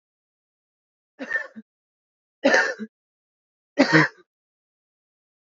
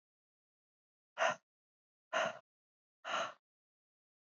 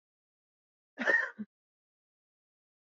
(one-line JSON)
{"three_cough_length": "5.5 s", "three_cough_amplitude": 26381, "three_cough_signal_mean_std_ratio": 0.27, "exhalation_length": "4.3 s", "exhalation_amplitude": 3259, "exhalation_signal_mean_std_ratio": 0.28, "cough_length": "3.0 s", "cough_amplitude": 7030, "cough_signal_mean_std_ratio": 0.25, "survey_phase": "beta (2021-08-13 to 2022-03-07)", "age": "18-44", "gender": "Female", "wearing_mask": "No", "symptom_cough_any": true, "symptom_runny_or_blocked_nose": true, "symptom_shortness_of_breath": true, "symptom_sore_throat": true, "symptom_abdominal_pain": true, "symptom_fatigue": true, "symptom_headache": true, "symptom_change_to_sense_of_smell_or_taste": true, "symptom_loss_of_taste": true, "symptom_other": true, "symptom_onset": "4 days", "smoker_status": "Never smoked", "respiratory_condition_asthma": false, "respiratory_condition_other": false, "recruitment_source": "Test and Trace", "submission_delay": "2 days", "covid_test_result": "Positive", "covid_test_method": "RT-qPCR", "covid_ct_value": 23.0, "covid_ct_gene": "N gene"}